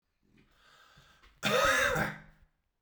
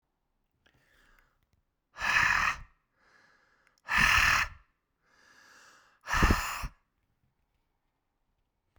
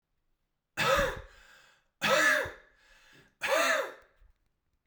{"cough_length": "2.8 s", "cough_amplitude": 6138, "cough_signal_mean_std_ratio": 0.44, "exhalation_length": "8.8 s", "exhalation_amplitude": 9993, "exhalation_signal_mean_std_ratio": 0.35, "three_cough_length": "4.9 s", "three_cough_amplitude": 7596, "three_cough_signal_mean_std_ratio": 0.45, "survey_phase": "beta (2021-08-13 to 2022-03-07)", "age": "18-44", "gender": "Male", "wearing_mask": "No", "symptom_headache": true, "smoker_status": "Never smoked", "respiratory_condition_asthma": false, "respiratory_condition_other": false, "recruitment_source": "Test and Trace", "submission_delay": "2 days", "covid_test_result": "Positive", "covid_test_method": "RT-qPCR"}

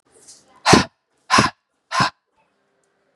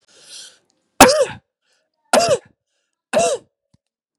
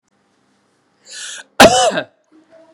{"exhalation_length": "3.2 s", "exhalation_amplitude": 32768, "exhalation_signal_mean_std_ratio": 0.31, "three_cough_length": "4.2 s", "three_cough_amplitude": 32768, "three_cough_signal_mean_std_ratio": 0.33, "cough_length": "2.7 s", "cough_amplitude": 32768, "cough_signal_mean_std_ratio": 0.31, "survey_phase": "beta (2021-08-13 to 2022-03-07)", "age": "18-44", "gender": "Male", "wearing_mask": "No", "symptom_runny_or_blocked_nose": true, "symptom_fatigue": true, "symptom_fever_high_temperature": true, "symptom_other": true, "smoker_status": "Never smoked", "respiratory_condition_asthma": false, "respiratory_condition_other": false, "recruitment_source": "Test and Trace", "submission_delay": "2 days", "covid_test_result": "Positive", "covid_test_method": "RT-qPCR", "covid_ct_value": 16.3, "covid_ct_gene": "ORF1ab gene", "covid_ct_mean": 16.8, "covid_viral_load": "3100000 copies/ml", "covid_viral_load_category": "High viral load (>1M copies/ml)"}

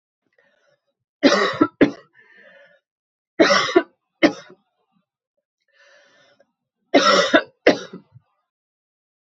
{"three_cough_length": "9.4 s", "three_cough_amplitude": 32767, "three_cough_signal_mean_std_ratio": 0.31, "survey_phase": "beta (2021-08-13 to 2022-03-07)", "age": "45-64", "gender": "Female", "wearing_mask": "No", "symptom_cough_any": true, "symptom_runny_or_blocked_nose": true, "symptom_sore_throat": true, "symptom_fatigue": true, "symptom_fever_high_temperature": true, "symptom_headache": true, "symptom_other": true, "symptom_onset": "3 days", "smoker_status": "Never smoked", "respiratory_condition_asthma": false, "respiratory_condition_other": false, "recruitment_source": "Test and Trace", "submission_delay": "1 day", "covid_test_result": "Positive", "covid_test_method": "RT-qPCR", "covid_ct_value": 13.3, "covid_ct_gene": "ORF1ab gene", "covid_ct_mean": 13.5, "covid_viral_load": "38000000 copies/ml", "covid_viral_load_category": "High viral load (>1M copies/ml)"}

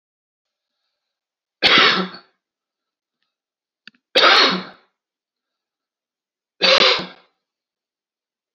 {"three_cough_length": "8.5 s", "three_cough_amplitude": 32767, "three_cough_signal_mean_std_ratio": 0.31, "survey_phase": "beta (2021-08-13 to 2022-03-07)", "age": "45-64", "gender": "Male", "wearing_mask": "No", "symptom_none": true, "smoker_status": "Never smoked", "respiratory_condition_asthma": false, "respiratory_condition_other": false, "recruitment_source": "REACT", "submission_delay": "3 days", "covid_test_result": "Negative", "covid_test_method": "RT-qPCR", "influenza_a_test_result": "Negative", "influenza_b_test_result": "Negative"}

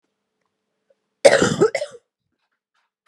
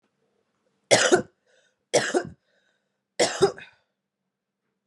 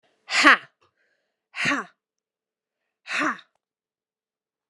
{"cough_length": "3.1 s", "cough_amplitude": 32768, "cough_signal_mean_std_ratio": 0.28, "three_cough_length": "4.9 s", "three_cough_amplitude": 30310, "three_cough_signal_mean_std_ratio": 0.31, "exhalation_length": "4.7 s", "exhalation_amplitude": 32767, "exhalation_signal_mean_std_ratio": 0.26, "survey_phase": "beta (2021-08-13 to 2022-03-07)", "age": "18-44", "gender": "Female", "wearing_mask": "No", "symptom_cough_any": true, "symptom_runny_or_blocked_nose": true, "symptom_change_to_sense_of_smell_or_taste": true, "symptom_loss_of_taste": true, "symptom_other": true, "symptom_onset": "5 days", "smoker_status": "Never smoked", "respiratory_condition_asthma": false, "respiratory_condition_other": false, "recruitment_source": "Test and Trace", "submission_delay": "1 day", "covid_test_result": "Positive", "covid_test_method": "RT-qPCR", "covid_ct_value": 17.5, "covid_ct_gene": "ORF1ab gene", "covid_ct_mean": 18.5, "covid_viral_load": "850000 copies/ml", "covid_viral_load_category": "Low viral load (10K-1M copies/ml)"}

